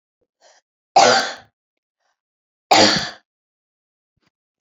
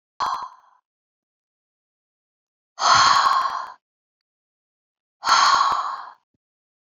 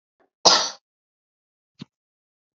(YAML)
three_cough_length: 4.6 s
three_cough_amplitude: 29468
three_cough_signal_mean_std_ratio: 0.3
exhalation_length: 6.8 s
exhalation_amplitude: 23748
exhalation_signal_mean_std_ratio: 0.41
cough_length: 2.6 s
cough_amplitude: 30847
cough_signal_mean_std_ratio: 0.22
survey_phase: beta (2021-08-13 to 2022-03-07)
age: 65+
gender: Female
wearing_mask: 'No'
symptom_none: true
smoker_status: Never smoked
respiratory_condition_asthma: false
respiratory_condition_other: false
recruitment_source: REACT
submission_delay: 1 day
covid_test_result: Negative
covid_test_method: RT-qPCR
influenza_a_test_result: Negative
influenza_b_test_result: Negative